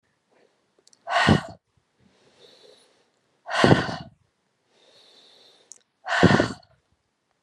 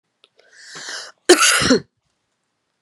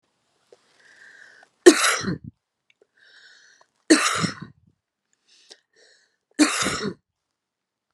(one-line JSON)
{"exhalation_length": "7.4 s", "exhalation_amplitude": 32613, "exhalation_signal_mean_std_ratio": 0.29, "cough_length": "2.8 s", "cough_amplitude": 32768, "cough_signal_mean_std_ratio": 0.35, "three_cough_length": "7.9 s", "three_cough_amplitude": 32768, "three_cough_signal_mean_std_ratio": 0.27, "survey_phase": "beta (2021-08-13 to 2022-03-07)", "age": "45-64", "gender": "Female", "wearing_mask": "No", "symptom_runny_or_blocked_nose": true, "symptom_sore_throat": true, "smoker_status": "Ex-smoker", "respiratory_condition_asthma": false, "respiratory_condition_other": false, "recruitment_source": "Test and Trace", "submission_delay": "1 day", "covid_test_result": "Positive", "covid_test_method": "RT-qPCR", "covid_ct_value": 16.2, "covid_ct_gene": "ORF1ab gene", "covid_ct_mean": 17.4, "covid_viral_load": "2000000 copies/ml", "covid_viral_load_category": "High viral load (>1M copies/ml)"}